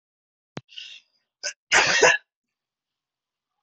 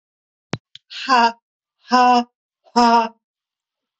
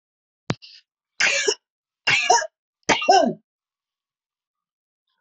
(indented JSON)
{
  "cough_length": "3.6 s",
  "cough_amplitude": 21662,
  "cough_signal_mean_std_ratio": 0.3,
  "exhalation_length": "4.0 s",
  "exhalation_amplitude": 23571,
  "exhalation_signal_mean_std_ratio": 0.41,
  "three_cough_length": "5.2 s",
  "three_cough_amplitude": 22311,
  "three_cough_signal_mean_std_ratio": 0.36,
  "survey_phase": "beta (2021-08-13 to 2022-03-07)",
  "age": "45-64",
  "gender": "Female",
  "wearing_mask": "No",
  "symptom_cough_any": true,
  "symptom_runny_or_blocked_nose": true,
  "smoker_status": "Ex-smoker",
  "respiratory_condition_asthma": false,
  "respiratory_condition_other": false,
  "recruitment_source": "REACT",
  "submission_delay": "0 days",
  "covid_test_result": "Negative",
  "covid_test_method": "RT-qPCR",
  "influenza_a_test_result": "Negative",
  "influenza_b_test_result": "Negative"
}